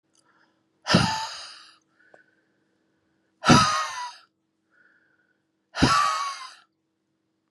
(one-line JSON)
{"exhalation_length": "7.5 s", "exhalation_amplitude": 23615, "exhalation_signal_mean_std_ratio": 0.34, "survey_phase": "beta (2021-08-13 to 2022-03-07)", "age": "18-44", "gender": "Female", "wearing_mask": "No", "symptom_none": true, "smoker_status": "Never smoked", "respiratory_condition_asthma": false, "respiratory_condition_other": false, "recruitment_source": "REACT", "submission_delay": "2 days", "covid_test_result": "Negative", "covid_test_method": "RT-qPCR"}